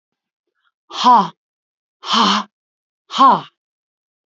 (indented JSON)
{
  "exhalation_length": "4.3 s",
  "exhalation_amplitude": 28277,
  "exhalation_signal_mean_std_ratio": 0.36,
  "survey_phase": "alpha (2021-03-01 to 2021-08-12)",
  "age": "45-64",
  "gender": "Female",
  "wearing_mask": "No",
  "symptom_none": true,
  "symptom_onset": "12 days",
  "smoker_status": "Never smoked",
  "respiratory_condition_asthma": false,
  "respiratory_condition_other": false,
  "recruitment_source": "REACT",
  "submission_delay": "2 days",
  "covid_test_result": "Negative",
  "covid_test_method": "RT-qPCR"
}